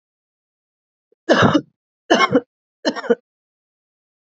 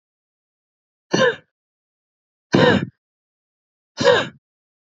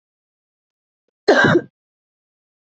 {"three_cough_length": "4.3 s", "three_cough_amplitude": 27817, "three_cough_signal_mean_std_ratio": 0.32, "exhalation_length": "4.9 s", "exhalation_amplitude": 32395, "exhalation_signal_mean_std_ratio": 0.31, "cough_length": "2.7 s", "cough_amplitude": 27517, "cough_signal_mean_std_ratio": 0.28, "survey_phase": "beta (2021-08-13 to 2022-03-07)", "age": "18-44", "gender": "Female", "wearing_mask": "No", "symptom_sore_throat": true, "symptom_onset": "5 days", "smoker_status": "Never smoked", "respiratory_condition_asthma": false, "respiratory_condition_other": false, "recruitment_source": "REACT", "submission_delay": "1 day", "covid_test_result": "Negative", "covid_test_method": "RT-qPCR"}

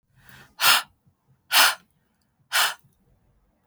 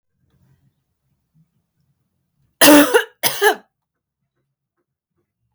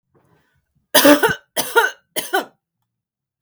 {"exhalation_length": "3.7 s", "exhalation_amplitude": 24858, "exhalation_signal_mean_std_ratio": 0.33, "cough_length": "5.5 s", "cough_amplitude": 32768, "cough_signal_mean_std_ratio": 0.26, "three_cough_length": "3.4 s", "three_cough_amplitude": 32768, "three_cough_signal_mean_std_ratio": 0.36, "survey_phase": "alpha (2021-03-01 to 2021-08-12)", "age": "18-44", "gender": "Female", "wearing_mask": "No", "symptom_none": true, "smoker_status": "Ex-smoker", "respiratory_condition_asthma": false, "respiratory_condition_other": false, "recruitment_source": "REACT", "submission_delay": "6 days", "covid_test_result": "Negative", "covid_test_method": "RT-qPCR"}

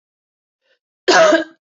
{"cough_length": "1.8 s", "cough_amplitude": 26442, "cough_signal_mean_std_ratio": 0.38, "survey_phase": "beta (2021-08-13 to 2022-03-07)", "age": "45-64", "gender": "Female", "wearing_mask": "Yes", "symptom_change_to_sense_of_smell_or_taste": true, "symptom_loss_of_taste": true, "symptom_other": true, "smoker_status": "Never smoked", "respiratory_condition_asthma": false, "respiratory_condition_other": false, "recruitment_source": "Test and Trace", "submission_delay": "2 days", "covid_test_result": "Positive", "covid_test_method": "RT-qPCR", "covid_ct_value": 15.4, "covid_ct_gene": "ORF1ab gene", "covid_ct_mean": 15.7, "covid_viral_load": "7100000 copies/ml", "covid_viral_load_category": "High viral load (>1M copies/ml)"}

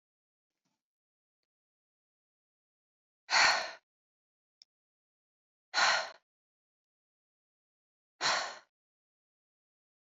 {"exhalation_length": "10.2 s", "exhalation_amplitude": 7931, "exhalation_signal_mean_std_ratio": 0.23, "survey_phase": "beta (2021-08-13 to 2022-03-07)", "age": "18-44", "gender": "Female", "wearing_mask": "No", "symptom_none": true, "smoker_status": "Never smoked", "respiratory_condition_asthma": false, "respiratory_condition_other": false, "recruitment_source": "REACT", "submission_delay": "1 day", "covid_test_result": "Negative", "covid_test_method": "RT-qPCR"}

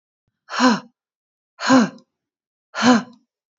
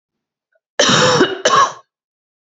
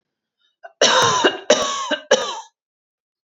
{"exhalation_length": "3.6 s", "exhalation_amplitude": 26330, "exhalation_signal_mean_std_ratio": 0.36, "cough_length": "2.6 s", "cough_amplitude": 32768, "cough_signal_mean_std_ratio": 0.48, "three_cough_length": "3.3 s", "three_cough_amplitude": 28984, "three_cough_signal_mean_std_ratio": 0.47, "survey_phase": "beta (2021-08-13 to 2022-03-07)", "age": "18-44", "gender": "Female", "wearing_mask": "No", "symptom_none": true, "smoker_status": "Never smoked", "respiratory_condition_asthma": false, "respiratory_condition_other": false, "recruitment_source": "REACT", "submission_delay": "1 day", "covid_test_result": "Negative", "covid_test_method": "RT-qPCR", "influenza_a_test_result": "Unknown/Void", "influenza_b_test_result": "Unknown/Void"}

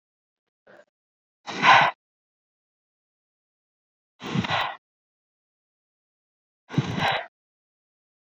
{"exhalation_length": "8.4 s", "exhalation_amplitude": 23956, "exhalation_signal_mean_std_ratio": 0.26, "survey_phase": "beta (2021-08-13 to 2022-03-07)", "age": "18-44", "gender": "Female", "wearing_mask": "No", "symptom_cough_any": true, "symptom_runny_or_blocked_nose": true, "symptom_shortness_of_breath": true, "symptom_fever_high_temperature": true, "symptom_headache": true, "smoker_status": "Ex-smoker", "respiratory_condition_asthma": false, "respiratory_condition_other": false, "recruitment_source": "Test and Trace", "submission_delay": "3 days", "covid_test_result": "Positive", "covid_test_method": "RT-qPCR", "covid_ct_value": 26.0, "covid_ct_gene": "ORF1ab gene"}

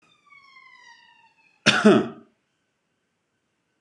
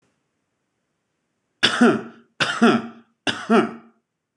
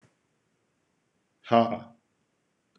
{"cough_length": "3.8 s", "cough_amplitude": 25297, "cough_signal_mean_std_ratio": 0.25, "three_cough_length": "4.4 s", "three_cough_amplitude": 25513, "three_cough_signal_mean_std_ratio": 0.37, "exhalation_length": "2.8 s", "exhalation_amplitude": 14484, "exhalation_signal_mean_std_ratio": 0.22, "survey_phase": "beta (2021-08-13 to 2022-03-07)", "age": "18-44", "gender": "Male", "wearing_mask": "No", "symptom_none": true, "symptom_onset": "12 days", "smoker_status": "Never smoked", "respiratory_condition_asthma": false, "respiratory_condition_other": false, "recruitment_source": "REACT", "submission_delay": "0 days", "covid_test_result": "Negative", "covid_test_method": "RT-qPCR", "influenza_a_test_result": "Negative", "influenza_b_test_result": "Negative"}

